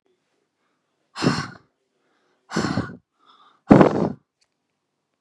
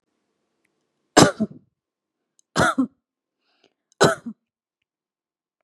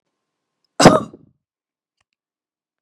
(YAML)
exhalation_length: 5.2 s
exhalation_amplitude: 32768
exhalation_signal_mean_std_ratio: 0.27
three_cough_length: 5.6 s
three_cough_amplitude: 32767
three_cough_signal_mean_std_ratio: 0.24
cough_length: 2.8 s
cough_amplitude: 32768
cough_signal_mean_std_ratio: 0.2
survey_phase: beta (2021-08-13 to 2022-03-07)
age: 18-44
gender: Female
wearing_mask: 'No'
symptom_none: true
smoker_status: Never smoked
respiratory_condition_asthma: false
respiratory_condition_other: false
recruitment_source: REACT
submission_delay: 2 days
covid_test_result: Negative
covid_test_method: RT-qPCR
influenza_a_test_result: Negative
influenza_b_test_result: Negative